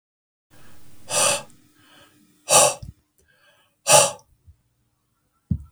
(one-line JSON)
{"exhalation_length": "5.7 s", "exhalation_amplitude": 32768, "exhalation_signal_mean_std_ratio": 0.31, "survey_phase": "beta (2021-08-13 to 2022-03-07)", "age": "45-64", "gender": "Male", "wearing_mask": "No", "symptom_none": true, "smoker_status": "Ex-smoker", "respiratory_condition_asthma": false, "respiratory_condition_other": false, "recruitment_source": "REACT", "submission_delay": "1 day", "covid_test_result": "Negative", "covid_test_method": "RT-qPCR", "influenza_a_test_result": "Negative", "influenza_b_test_result": "Negative"}